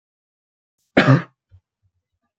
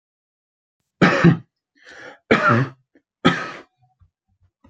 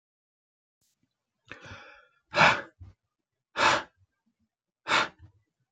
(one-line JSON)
{"cough_length": "2.4 s", "cough_amplitude": 32767, "cough_signal_mean_std_ratio": 0.24, "three_cough_length": "4.7 s", "three_cough_amplitude": 26873, "three_cough_signal_mean_std_ratio": 0.35, "exhalation_length": "5.7 s", "exhalation_amplitude": 15090, "exhalation_signal_mean_std_ratio": 0.28, "survey_phase": "beta (2021-08-13 to 2022-03-07)", "age": "18-44", "gender": "Male", "wearing_mask": "No", "symptom_cough_any": true, "symptom_sore_throat": true, "symptom_fatigue": true, "symptom_onset": "5 days", "smoker_status": "Never smoked", "respiratory_condition_asthma": false, "respiratory_condition_other": false, "recruitment_source": "Test and Trace", "submission_delay": "2 days", "covid_test_result": "Positive", "covid_test_method": "ePCR"}